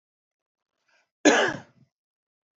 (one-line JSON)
{"cough_length": "2.6 s", "cough_amplitude": 22722, "cough_signal_mean_std_ratio": 0.25, "survey_phase": "alpha (2021-03-01 to 2021-08-12)", "age": "18-44", "gender": "Male", "wearing_mask": "No", "symptom_cough_any": true, "symptom_shortness_of_breath": true, "symptom_fatigue": true, "symptom_headache": true, "smoker_status": "Never smoked", "respiratory_condition_asthma": false, "respiratory_condition_other": false, "recruitment_source": "Test and Trace", "submission_delay": "1 day", "covid_test_result": "Positive", "covid_test_method": "RT-qPCR", "covid_ct_value": 20.3, "covid_ct_gene": "ORF1ab gene", "covid_ct_mean": 21.3, "covid_viral_load": "100000 copies/ml", "covid_viral_load_category": "Low viral load (10K-1M copies/ml)"}